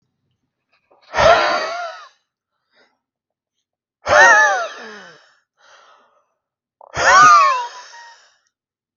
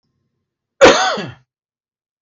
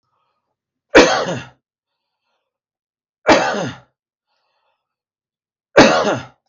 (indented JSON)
{
  "exhalation_length": "9.0 s",
  "exhalation_amplitude": 32768,
  "exhalation_signal_mean_std_ratio": 0.38,
  "cough_length": "2.2 s",
  "cough_amplitude": 32768,
  "cough_signal_mean_std_ratio": 0.31,
  "three_cough_length": "6.5 s",
  "three_cough_amplitude": 32768,
  "three_cough_signal_mean_std_ratio": 0.31,
  "survey_phase": "beta (2021-08-13 to 2022-03-07)",
  "age": "45-64",
  "gender": "Male",
  "wearing_mask": "No",
  "symptom_cough_any": true,
  "smoker_status": "Never smoked",
  "respiratory_condition_asthma": false,
  "respiratory_condition_other": false,
  "recruitment_source": "REACT",
  "submission_delay": "1 day",
  "covid_test_result": "Negative",
  "covid_test_method": "RT-qPCR"
}